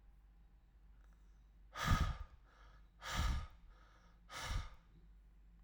exhalation_length: 5.6 s
exhalation_amplitude: 3049
exhalation_signal_mean_std_ratio: 0.43
survey_phase: alpha (2021-03-01 to 2021-08-12)
age: 18-44
gender: Male
wearing_mask: 'No'
symptom_none: true
smoker_status: Ex-smoker
respiratory_condition_asthma: false
respiratory_condition_other: false
recruitment_source: REACT
submission_delay: 3 days
covid_test_result: Negative
covid_test_method: RT-qPCR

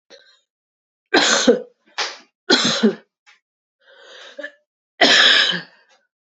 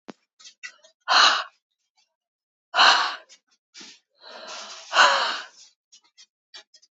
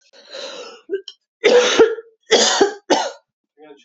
three_cough_length: 6.2 s
three_cough_amplitude: 32025
three_cough_signal_mean_std_ratio: 0.41
exhalation_length: 6.9 s
exhalation_amplitude: 25108
exhalation_signal_mean_std_ratio: 0.34
cough_length: 3.8 s
cough_amplitude: 32767
cough_signal_mean_std_ratio: 0.48
survey_phase: beta (2021-08-13 to 2022-03-07)
age: 18-44
gender: Female
wearing_mask: 'No'
symptom_cough_any: true
symptom_runny_or_blocked_nose: true
symptom_shortness_of_breath: true
symptom_sore_throat: true
symptom_fatigue: true
symptom_headache: true
symptom_other: true
symptom_onset: 2 days
smoker_status: Ex-smoker
respiratory_condition_asthma: false
respiratory_condition_other: false
recruitment_source: Test and Trace
submission_delay: 2 days
covid_test_result: Positive
covid_test_method: RT-qPCR
covid_ct_value: 24.4
covid_ct_gene: ORF1ab gene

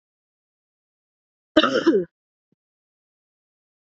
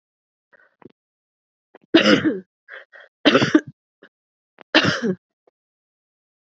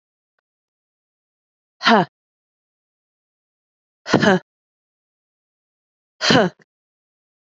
cough_length: 3.8 s
cough_amplitude: 28585
cough_signal_mean_std_ratio: 0.25
three_cough_length: 6.5 s
three_cough_amplitude: 32767
three_cough_signal_mean_std_ratio: 0.31
exhalation_length: 7.5 s
exhalation_amplitude: 32768
exhalation_signal_mean_std_ratio: 0.23
survey_phase: beta (2021-08-13 to 2022-03-07)
age: 18-44
gender: Female
wearing_mask: 'No'
symptom_cough_any: true
symptom_runny_or_blocked_nose: true
symptom_shortness_of_breath: true
symptom_sore_throat: true
symptom_fatigue: true
symptom_headache: true
symptom_onset: 4 days
smoker_status: Never smoked
respiratory_condition_asthma: true
respiratory_condition_other: false
recruitment_source: Test and Trace
submission_delay: 2 days
covid_test_result: Positive
covid_test_method: RT-qPCR
covid_ct_value: 18.2
covid_ct_gene: ORF1ab gene
covid_ct_mean: 18.5
covid_viral_load: 880000 copies/ml
covid_viral_load_category: Low viral load (10K-1M copies/ml)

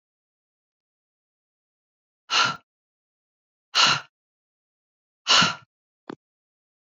exhalation_length: 7.0 s
exhalation_amplitude: 20422
exhalation_signal_mean_std_ratio: 0.25
survey_phase: beta (2021-08-13 to 2022-03-07)
age: 18-44
gender: Female
wearing_mask: 'No'
symptom_cough_any: true
symptom_new_continuous_cough: true
symptom_runny_or_blocked_nose: true
symptom_fatigue: true
symptom_fever_high_temperature: true
symptom_headache: true
symptom_change_to_sense_of_smell_or_taste: true
smoker_status: Never smoked
respiratory_condition_asthma: false
respiratory_condition_other: false
recruitment_source: Test and Trace
submission_delay: 2 days
covid_test_result: Positive
covid_test_method: RT-qPCR
covid_ct_value: 18.9
covid_ct_gene: N gene
covid_ct_mean: 20.0
covid_viral_load: 280000 copies/ml
covid_viral_load_category: Low viral load (10K-1M copies/ml)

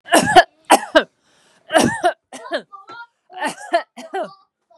three_cough_length: 4.8 s
three_cough_amplitude: 32768
three_cough_signal_mean_std_ratio: 0.38
survey_phase: beta (2021-08-13 to 2022-03-07)
age: 18-44
gender: Female
wearing_mask: 'No'
symptom_none: true
smoker_status: Ex-smoker
respiratory_condition_asthma: false
respiratory_condition_other: false
recruitment_source: REACT
submission_delay: 1 day
covid_test_result: Negative
covid_test_method: RT-qPCR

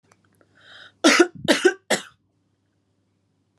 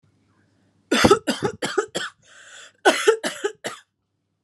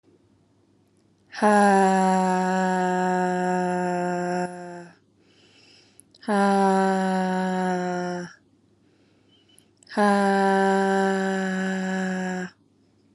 three_cough_length: 3.6 s
three_cough_amplitude: 27955
three_cough_signal_mean_std_ratio: 0.3
cough_length: 4.4 s
cough_amplitude: 31679
cough_signal_mean_std_ratio: 0.38
exhalation_length: 13.1 s
exhalation_amplitude: 16388
exhalation_signal_mean_std_ratio: 0.67
survey_phase: alpha (2021-03-01 to 2021-08-12)
age: 18-44
gender: Female
wearing_mask: 'No'
symptom_none: true
smoker_status: Never smoked
respiratory_condition_asthma: false
respiratory_condition_other: false
recruitment_source: REACT
submission_delay: 5 days
covid_test_result: Negative
covid_test_method: RT-qPCR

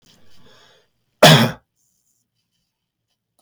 cough_length: 3.4 s
cough_amplitude: 32768
cough_signal_mean_std_ratio: 0.23
survey_phase: beta (2021-08-13 to 2022-03-07)
age: 45-64
gender: Male
wearing_mask: 'No'
symptom_headache: true
smoker_status: Never smoked
respiratory_condition_asthma: false
respiratory_condition_other: false
recruitment_source: REACT
submission_delay: 1 day
covid_test_result: Negative
covid_test_method: RT-qPCR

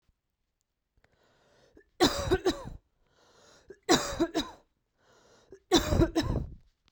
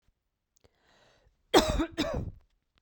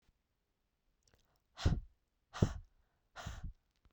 three_cough_length: 6.9 s
three_cough_amplitude: 11795
three_cough_signal_mean_std_ratio: 0.37
cough_length: 2.8 s
cough_amplitude: 14328
cough_signal_mean_std_ratio: 0.33
exhalation_length: 3.9 s
exhalation_amplitude: 7123
exhalation_signal_mean_std_ratio: 0.25
survey_phase: beta (2021-08-13 to 2022-03-07)
age: 18-44
gender: Female
wearing_mask: 'No'
symptom_abdominal_pain: true
symptom_fatigue: true
smoker_status: Never smoked
respiratory_condition_asthma: false
respiratory_condition_other: false
recruitment_source: REACT
submission_delay: 2 days
covid_test_result: Negative
covid_test_method: RT-qPCR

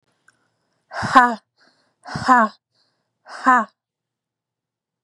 exhalation_length: 5.0 s
exhalation_amplitude: 32768
exhalation_signal_mean_std_ratio: 0.3
survey_phase: beta (2021-08-13 to 2022-03-07)
age: 18-44
gender: Female
wearing_mask: 'No'
symptom_cough_any: true
symptom_runny_or_blocked_nose: true
symptom_fever_high_temperature: true
symptom_onset: 9 days
smoker_status: Never smoked
respiratory_condition_asthma: true
respiratory_condition_other: false
recruitment_source: REACT
submission_delay: 0 days
covid_test_result: Negative
covid_test_method: RT-qPCR
influenza_a_test_result: Unknown/Void
influenza_b_test_result: Unknown/Void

